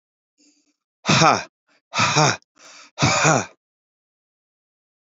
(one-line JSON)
{"exhalation_length": "5.0 s", "exhalation_amplitude": 28236, "exhalation_signal_mean_std_ratio": 0.38, "survey_phase": "beta (2021-08-13 to 2022-03-07)", "age": "45-64", "gender": "Male", "wearing_mask": "No", "symptom_none": true, "smoker_status": "Current smoker (e-cigarettes or vapes only)", "respiratory_condition_asthma": false, "respiratory_condition_other": false, "recruitment_source": "REACT", "submission_delay": "2 days", "covid_test_result": "Negative", "covid_test_method": "RT-qPCR", "influenza_a_test_result": "Unknown/Void", "influenza_b_test_result": "Unknown/Void"}